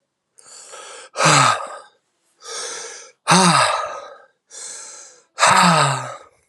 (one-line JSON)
{"exhalation_length": "6.5 s", "exhalation_amplitude": 31952, "exhalation_signal_mean_std_ratio": 0.48, "survey_phase": "alpha (2021-03-01 to 2021-08-12)", "age": "18-44", "gender": "Male", "wearing_mask": "No", "symptom_cough_any": true, "symptom_fever_high_temperature": true, "symptom_onset": "5 days", "smoker_status": "Never smoked", "respiratory_condition_asthma": false, "respiratory_condition_other": false, "recruitment_source": "Test and Trace", "submission_delay": "2 days", "covid_test_result": "Positive", "covid_test_method": "RT-qPCR", "covid_ct_value": 12.8, "covid_ct_gene": "N gene", "covid_ct_mean": 15.0, "covid_viral_load": "12000000 copies/ml", "covid_viral_load_category": "High viral load (>1M copies/ml)"}